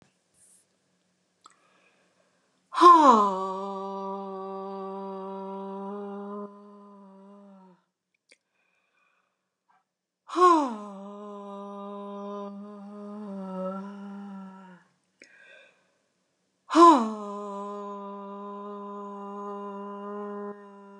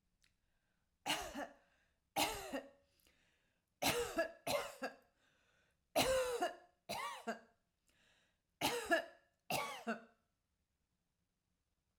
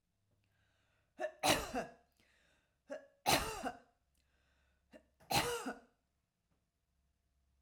exhalation_length: 21.0 s
exhalation_amplitude: 21647
exhalation_signal_mean_std_ratio: 0.35
cough_length: 12.0 s
cough_amplitude: 3280
cough_signal_mean_std_ratio: 0.42
three_cough_length: 7.6 s
three_cough_amplitude: 4981
three_cough_signal_mean_std_ratio: 0.32
survey_phase: alpha (2021-03-01 to 2021-08-12)
age: 45-64
gender: Female
wearing_mask: 'No'
symptom_none: true
smoker_status: Never smoked
respiratory_condition_asthma: false
respiratory_condition_other: false
recruitment_source: REACT
submission_delay: 2 days
covid_test_result: Negative
covid_test_method: RT-qPCR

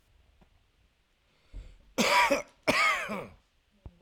cough_length: 4.0 s
cough_amplitude: 9439
cough_signal_mean_std_ratio: 0.41
survey_phase: alpha (2021-03-01 to 2021-08-12)
age: 18-44
gender: Male
wearing_mask: 'No'
symptom_none: true
smoker_status: Current smoker (11 or more cigarettes per day)
respiratory_condition_asthma: false
respiratory_condition_other: false
recruitment_source: REACT
submission_delay: 0 days
covid_test_result: Negative
covid_test_method: RT-qPCR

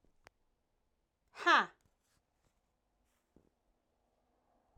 exhalation_length: 4.8 s
exhalation_amplitude: 5551
exhalation_signal_mean_std_ratio: 0.17
survey_phase: alpha (2021-03-01 to 2021-08-12)
age: 45-64
gender: Female
wearing_mask: 'No'
symptom_none: true
smoker_status: Never smoked
respiratory_condition_asthma: false
respiratory_condition_other: false
recruitment_source: REACT
submission_delay: 2 days
covid_test_result: Negative
covid_test_method: RT-qPCR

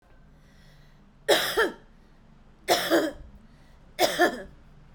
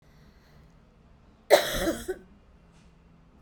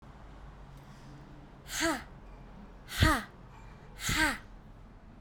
three_cough_length: 4.9 s
three_cough_amplitude: 15619
three_cough_signal_mean_std_ratio: 0.42
cough_length: 3.4 s
cough_amplitude: 19615
cough_signal_mean_std_ratio: 0.28
exhalation_length: 5.2 s
exhalation_amplitude: 8255
exhalation_signal_mean_std_ratio: 0.46
survey_phase: beta (2021-08-13 to 2022-03-07)
age: 45-64
gender: Female
wearing_mask: 'No'
symptom_none: true
symptom_onset: 12 days
smoker_status: Never smoked
respiratory_condition_asthma: false
respiratory_condition_other: false
recruitment_source: REACT
submission_delay: 1 day
covid_test_result: Negative
covid_test_method: RT-qPCR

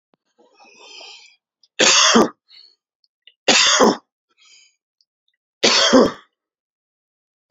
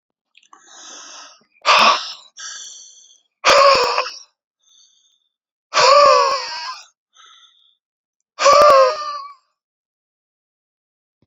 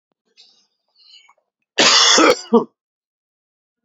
three_cough_length: 7.5 s
three_cough_amplitude: 31760
three_cough_signal_mean_std_ratio: 0.36
exhalation_length: 11.3 s
exhalation_amplitude: 31298
exhalation_signal_mean_std_ratio: 0.39
cough_length: 3.8 s
cough_amplitude: 32043
cough_signal_mean_std_ratio: 0.35
survey_phase: beta (2021-08-13 to 2022-03-07)
age: 45-64
gender: Male
wearing_mask: 'No'
symptom_sore_throat: true
symptom_fatigue: true
symptom_headache: true
symptom_change_to_sense_of_smell_or_taste: true
symptom_other: true
symptom_onset: 4 days
smoker_status: Never smoked
recruitment_source: Test and Trace
submission_delay: 2 days
covid_test_result: Negative
covid_test_method: RT-qPCR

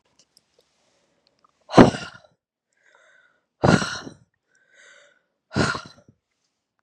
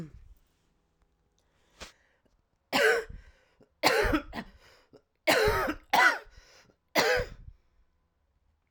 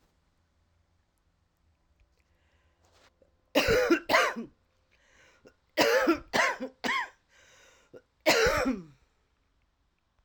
exhalation_length: 6.8 s
exhalation_amplitude: 32768
exhalation_signal_mean_std_ratio: 0.21
three_cough_length: 8.7 s
three_cough_amplitude: 13404
three_cough_signal_mean_std_ratio: 0.38
cough_length: 10.2 s
cough_amplitude: 12940
cough_signal_mean_std_ratio: 0.38
survey_phase: alpha (2021-03-01 to 2021-08-12)
age: 45-64
gender: Female
wearing_mask: 'No'
symptom_cough_any: true
symptom_shortness_of_breath: true
symptom_fatigue: true
symptom_headache: true
symptom_change_to_sense_of_smell_or_taste: true
symptom_loss_of_taste: true
symptom_onset: 6 days
smoker_status: Never smoked
respiratory_condition_asthma: false
respiratory_condition_other: false
recruitment_source: Test and Trace
submission_delay: 1 day
covid_test_result: Positive
covid_test_method: RT-qPCR
covid_ct_value: 25.9
covid_ct_gene: ORF1ab gene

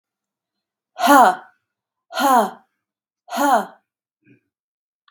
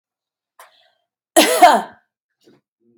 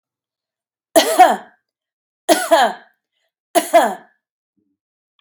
exhalation_length: 5.1 s
exhalation_amplitude: 32767
exhalation_signal_mean_std_ratio: 0.34
cough_length: 3.0 s
cough_amplitude: 32768
cough_signal_mean_std_ratio: 0.29
three_cough_length: 5.2 s
three_cough_amplitude: 32768
three_cough_signal_mean_std_ratio: 0.34
survey_phase: beta (2021-08-13 to 2022-03-07)
age: 45-64
gender: Female
wearing_mask: 'No'
symptom_cough_any: true
symptom_runny_or_blocked_nose: true
symptom_sore_throat: true
symptom_abdominal_pain: true
symptom_fatigue: true
symptom_headache: true
symptom_onset: 11 days
smoker_status: Never smoked
respiratory_condition_asthma: false
respiratory_condition_other: false
recruitment_source: REACT
submission_delay: 2 days
covid_test_result: Negative
covid_test_method: RT-qPCR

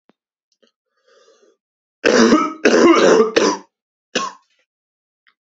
three_cough_length: 5.5 s
three_cough_amplitude: 32668
three_cough_signal_mean_std_ratio: 0.42
survey_phase: beta (2021-08-13 to 2022-03-07)
age: 18-44
gender: Male
wearing_mask: 'No'
symptom_cough_any: true
symptom_sore_throat: true
smoker_status: Never smoked
respiratory_condition_asthma: true
respiratory_condition_other: false
recruitment_source: REACT
submission_delay: 1 day
covid_test_result: Negative
covid_test_method: RT-qPCR
influenza_a_test_result: Negative
influenza_b_test_result: Negative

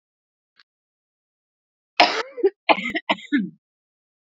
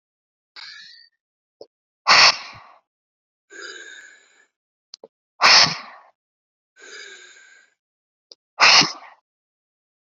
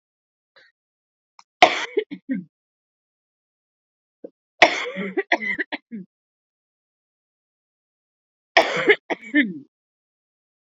cough_length: 4.3 s
cough_amplitude: 32768
cough_signal_mean_std_ratio: 0.3
exhalation_length: 10.1 s
exhalation_amplitude: 31262
exhalation_signal_mean_std_ratio: 0.26
three_cough_length: 10.7 s
three_cough_amplitude: 32768
three_cough_signal_mean_std_ratio: 0.26
survey_phase: beta (2021-08-13 to 2022-03-07)
age: 18-44
gender: Female
wearing_mask: 'No'
symptom_cough_any: true
symptom_runny_or_blocked_nose: true
symptom_sore_throat: true
symptom_abdominal_pain: true
symptom_fatigue: true
symptom_fever_high_temperature: true
symptom_change_to_sense_of_smell_or_taste: true
symptom_loss_of_taste: true
symptom_onset: 3 days
smoker_status: Ex-smoker
respiratory_condition_asthma: true
respiratory_condition_other: false
recruitment_source: Test and Trace
submission_delay: 2 days
covid_test_result: Positive
covid_test_method: RT-qPCR
covid_ct_value: 12.9
covid_ct_gene: ORF1ab gene
covid_ct_mean: 13.3
covid_viral_load: 44000000 copies/ml
covid_viral_load_category: High viral load (>1M copies/ml)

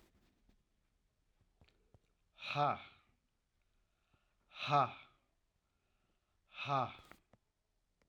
exhalation_length: 8.1 s
exhalation_amplitude: 3069
exhalation_signal_mean_std_ratio: 0.26
survey_phase: alpha (2021-03-01 to 2021-08-12)
age: 65+
gender: Male
wearing_mask: 'No'
symptom_none: true
smoker_status: Never smoked
respiratory_condition_asthma: false
respiratory_condition_other: false
recruitment_source: REACT
submission_delay: 2 days
covid_test_result: Negative
covid_test_method: RT-qPCR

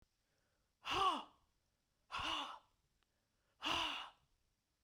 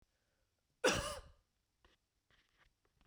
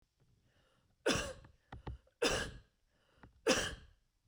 exhalation_length: 4.8 s
exhalation_amplitude: 1831
exhalation_signal_mean_std_ratio: 0.4
cough_length: 3.1 s
cough_amplitude: 3480
cough_signal_mean_std_ratio: 0.24
three_cough_length: 4.3 s
three_cough_amplitude: 5101
three_cough_signal_mean_std_ratio: 0.37
survey_phase: beta (2021-08-13 to 2022-03-07)
age: 45-64
gender: Female
wearing_mask: 'No'
symptom_none: true
smoker_status: Never smoked
respiratory_condition_asthma: false
respiratory_condition_other: false
recruitment_source: REACT
submission_delay: 2 days
covid_test_result: Negative
covid_test_method: RT-qPCR
influenza_a_test_result: Negative
influenza_b_test_result: Negative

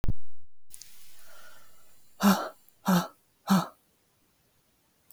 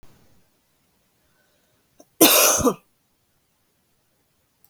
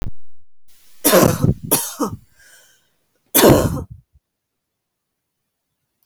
exhalation_length: 5.1 s
exhalation_amplitude: 12206
exhalation_signal_mean_std_ratio: 0.49
cough_length: 4.7 s
cough_amplitude: 32768
cough_signal_mean_std_ratio: 0.26
three_cough_length: 6.1 s
three_cough_amplitude: 32768
three_cough_signal_mean_std_ratio: 0.41
survey_phase: beta (2021-08-13 to 2022-03-07)
age: 18-44
gender: Female
wearing_mask: 'No'
symptom_none: true
symptom_onset: 3 days
smoker_status: Never smoked
respiratory_condition_asthma: false
respiratory_condition_other: false
recruitment_source: REACT
submission_delay: 1 day
covid_test_result: Negative
covid_test_method: RT-qPCR
influenza_a_test_result: Negative
influenza_b_test_result: Negative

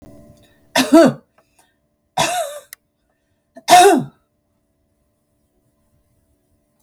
three_cough_length: 6.8 s
three_cough_amplitude: 32768
three_cough_signal_mean_std_ratio: 0.29
survey_phase: beta (2021-08-13 to 2022-03-07)
age: 65+
gender: Female
wearing_mask: 'No'
symptom_cough_any: true
symptom_runny_or_blocked_nose: true
smoker_status: Ex-smoker
respiratory_condition_asthma: false
respiratory_condition_other: false
recruitment_source: Test and Trace
submission_delay: 1 day
covid_test_result: Positive
covid_test_method: RT-qPCR
covid_ct_value: 19.0
covid_ct_gene: ORF1ab gene
covid_ct_mean: 19.6
covid_viral_load: 380000 copies/ml
covid_viral_load_category: Low viral load (10K-1M copies/ml)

